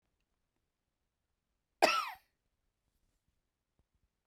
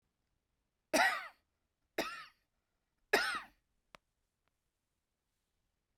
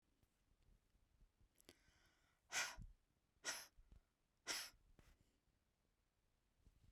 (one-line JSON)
{"cough_length": "4.3 s", "cough_amplitude": 8434, "cough_signal_mean_std_ratio": 0.17, "three_cough_length": "6.0 s", "three_cough_amplitude": 5772, "three_cough_signal_mean_std_ratio": 0.26, "exhalation_length": "6.9 s", "exhalation_amplitude": 1008, "exhalation_signal_mean_std_ratio": 0.3, "survey_phase": "beta (2021-08-13 to 2022-03-07)", "age": "18-44", "gender": "Female", "wearing_mask": "No", "symptom_none": true, "symptom_onset": "12 days", "smoker_status": "Never smoked", "respiratory_condition_asthma": false, "respiratory_condition_other": false, "recruitment_source": "REACT", "submission_delay": "1 day", "covid_test_result": "Negative", "covid_test_method": "RT-qPCR"}